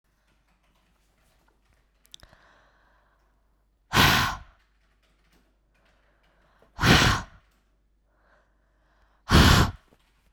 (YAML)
exhalation_length: 10.3 s
exhalation_amplitude: 25735
exhalation_signal_mean_std_ratio: 0.27
survey_phase: beta (2021-08-13 to 2022-03-07)
age: 18-44
gender: Female
wearing_mask: 'No'
symptom_runny_or_blocked_nose: true
symptom_sore_throat: true
symptom_headache: true
smoker_status: Never smoked
respiratory_condition_asthma: true
respiratory_condition_other: false
recruitment_source: REACT
submission_delay: 1 day
covid_test_result: Negative
covid_test_method: RT-qPCR